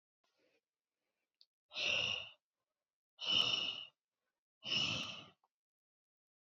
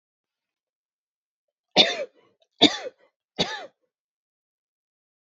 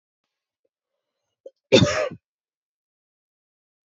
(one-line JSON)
{"exhalation_length": "6.5 s", "exhalation_amplitude": 3344, "exhalation_signal_mean_std_ratio": 0.4, "three_cough_length": "5.2 s", "three_cough_amplitude": 29680, "three_cough_signal_mean_std_ratio": 0.21, "cough_length": "3.8 s", "cough_amplitude": 26344, "cough_signal_mean_std_ratio": 0.21, "survey_phase": "beta (2021-08-13 to 2022-03-07)", "age": "18-44", "gender": "Female", "wearing_mask": "No", "symptom_none": true, "smoker_status": "Never smoked", "respiratory_condition_asthma": false, "respiratory_condition_other": false, "recruitment_source": "REACT", "submission_delay": "2 days", "covid_test_result": "Negative", "covid_test_method": "RT-qPCR", "influenza_a_test_result": "Negative", "influenza_b_test_result": "Negative"}